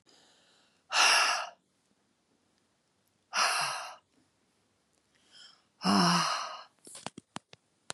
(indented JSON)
{
  "exhalation_length": "7.9 s",
  "exhalation_amplitude": 11520,
  "exhalation_signal_mean_std_ratio": 0.38,
  "survey_phase": "beta (2021-08-13 to 2022-03-07)",
  "age": "45-64",
  "gender": "Female",
  "wearing_mask": "No",
  "symptom_fatigue": true,
  "symptom_other": true,
  "symptom_onset": "3 days",
  "smoker_status": "Never smoked",
  "respiratory_condition_asthma": false,
  "respiratory_condition_other": false,
  "recruitment_source": "Test and Trace",
  "submission_delay": "2 days",
  "covid_test_result": "Positive",
  "covid_test_method": "RT-qPCR",
  "covid_ct_value": 15.5,
  "covid_ct_gene": "N gene",
  "covid_ct_mean": 15.5,
  "covid_viral_load": "8000000 copies/ml",
  "covid_viral_load_category": "High viral load (>1M copies/ml)"
}